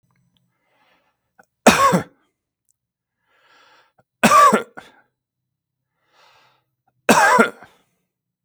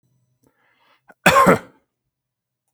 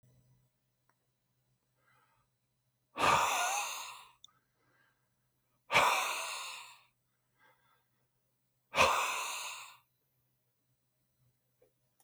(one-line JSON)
{"three_cough_length": "8.4 s", "three_cough_amplitude": 32768, "three_cough_signal_mean_std_ratio": 0.29, "cough_length": "2.7 s", "cough_amplitude": 32766, "cough_signal_mean_std_ratio": 0.28, "exhalation_length": "12.0 s", "exhalation_amplitude": 7815, "exhalation_signal_mean_std_ratio": 0.34, "survey_phase": "beta (2021-08-13 to 2022-03-07)", "age": "45-64", "gender": "Male", "wearing_mask": "No", "symptom_none": true, "smoker_status": "Never smoked", "respiratory_condition_asthma": false, "respiratory_condition_other": false, "recruitment_source": "REACT", "submission_delay": "2 days", "covid_test_result": "Negative", "covid_test_method": "RT-qPCR", "influenza_a_test_result": "Negative", "influenza_b_test_result": "Negative"}